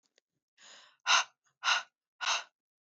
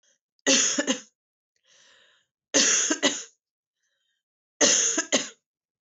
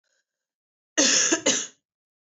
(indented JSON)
{
  "exhalation_length": "2.8 s",
  "exhalation_amplitude": 8507,
  "exhalation_signal_mean_std_ratio": 0.34,
  "three_cough_length": "5.9 s",
  "three_cough_amplitude": 15223,
  "three_cough_signal_mean_std_ratio": 0.42,
  "cough_length": "2.2 s",
  "cough_amplitude": 14993,
  "cough_signal_mean_std_ratio": 0.42,
  "survey_phase": "beta (2021-08-13 to 2022-03-07)",
  "age": "18-44",
  "gender": "Female",
  "wearing_mask": "No",
  "symptom_cough_any": true,
  "symptom_new_continuous_cough": true,
  "symptom_runny_or_blocked_nose": true,
  "symptom_sore_throat": true,
  "symptom_fatigue": true,
  "symptom_fever_high_temperature": true,
  "symptom_headache": true,
  "symptom_onset": "4 days",
  "smoker_status": "Never smoked",
  "respiratory_condition_asthma": true,
  "respiratory_condition_other": false,
  "recruitment_source": "Test and Trace",
  "submission_delay": "1 day",
  "covid_test_result": "Positive",
  "covid_test_method": "RT-qPCR"
}